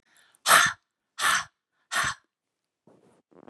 {
  "exhalation_length": "3.5 s",
  "exhalation_amplitude": 20322,
  "exhalation_signal_mean_std_ratio": 0.33,
  "survey_phase": "beta (2021-08-13 to 2022-03-07)",
  "age": "45-64",
  "gender": "Female",
  "wearing_mask": "No",
  "symptom_none": true,
  "smoker_status": "Never smoked",
  "respiratory_condition_asthma": false,
  "respiratory_condition_other": false,
  "recruitment_source": "REACT",
  "submission_delay": "1 day",
  "covid_test_result": "Negative",
  "covid_test_method": "RT-qPCR",
  "influenza_a_test_result": "Negative",
  "influenza_b_test_result": "Negative"
}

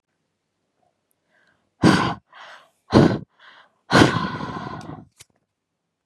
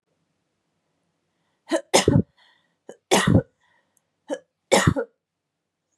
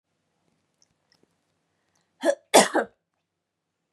{
  "exhalation_length": "6.1 s",
  "exhalation_amplitude": 32720,
  "exhalation_signal_mean_std_ratio": 0.32,
  "three_cough_length": "6.0 s",
  "three_cough_amplitude": 29791,
  "three_cough_signal_mean_std_ratio": 0.3,
  "cough_length": "3.9 s",
  "cough_amplitude": 28855,
  "cough_signal_mean_std_ratio": 0.21,
  "survey_phase": "beta (2021-08-13 to 2022-03-07)",
  "age": "18-44",
  "gender": "Female",
  "wearing_mask": "No",
  "symptom_fatigue": true,
  "symptom_headache": true,
  "smoker_status": "Never smoked",
  "respiratory_condition_asthma": false,
  "respiratory_condition_other": false,
  "recruitment_source": "REACT",
  "submission_delay": "1 day",
  "covid_test_result": "Negative",
  "covid_test_method": "RT-qPCR",
  "influenza_a_test_result": "Negative",
  "influenza_b_test_result": "Negative"
}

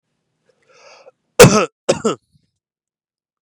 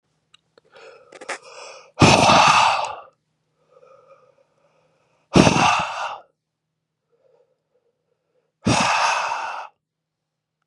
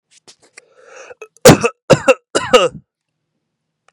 {
  "cough_length": "3.4 s",
  "cough_amplitude": 32768,
  "cough_signal_mean_std_ratio": 0.25,
  "exhalation_length": "10.7 s",
  "exhalation_amplitude": 32767,
  "exhalation_signal_mean_std_ratio": 0.38,
  "three_cough_length": "3.9 s",
  "three_cough_amplitude": 32768,
  "three_cough_signal_mean_std_ratio": 0.3,
  "survey_phase": "beta (2021-08-13 to 2022-03-07)",
  "age": "18-44",
  "gender": "Male",
  "wearing_mask": "No",
  "symptom_cough_any": true,
  "symptom_runny_or_blocked_nose": true,
  "symptom_sore_throat": true,
  "symptom_onset": "3 days",
  "smoker_status": "Never smoked",
  "respiratory_condition_asthma": false,
  "respiratory_condition_other": false,
  "recruitment_source": "REACT",
  "submission_delay": "2 days",
  "covid_test_result": "Negative",
  "covid_test_method": "RT-qPCR"
}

